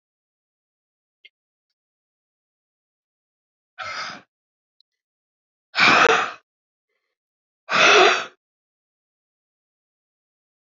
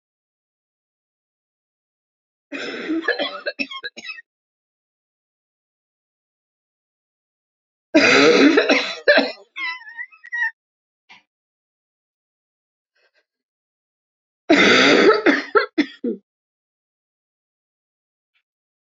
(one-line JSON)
{"exhalation_length": "10.8 s", "exhalation_amplitude": 25485, "exhalation_signal_mean_std_ratio": 0.25, "cough_length": "18.9 s", "cough_amplitude": 30634, "cough_signal_mean_std_ratio": 0.32, "survey_phase": "beta (2021-08-13 to 2022-03-07)", "age": "45-64", "gender": "Female", "wearing_mask": "No", "symptom_new_continuous_cough": true, "symptom_runny_or_blocked_nose": true, "symptom_abdominal_pain": true, "symptom_diarrhoea": true, "symptom_fever_high_temperature": true, "symptom_headache": true, "symptom_onset": "3 days", "smoker_status": "Never smoked", "respiratory_condition_asthma": false, "respiratory_condition_other": false, "recruitment_source": "Test and Trace", "submission_delay": "1 day", "covid_test_result": "Positive", "covid_test_method": "RT-qPCR"}